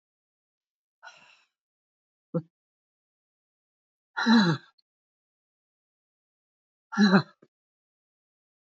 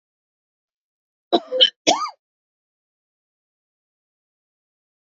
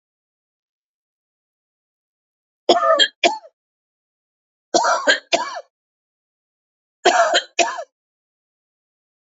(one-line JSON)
{"exhalation_length": "8.6 s", "exhalation_amplitude": 13313, "exhalation_signal_mean_std_ratio": 0.23, "cough_length": "5.0 s", "cough_amplitude": 27556, "cough_signal_mean_std_ratio": 0.21, "three_cough_length": "9.4 s", "three_cough_amplitude": 31435, "three_cough_signal_mean_std_ratio": 0.32, "survey_phase": "beta (2021-08-13 to 2022-03-07)", "age": "65+", "gender": "Female", "wearing_mask": "No", "symptom_none": true, "smoker_status": "Never smoked", "respiratory_condition_asthma": false, "respiratory_condition_other": false, "recruitment_source": "Test and Trace", "submission_delay": "1 day", "covid_test_result": "Negative", "covid_test_method": "ePCR"}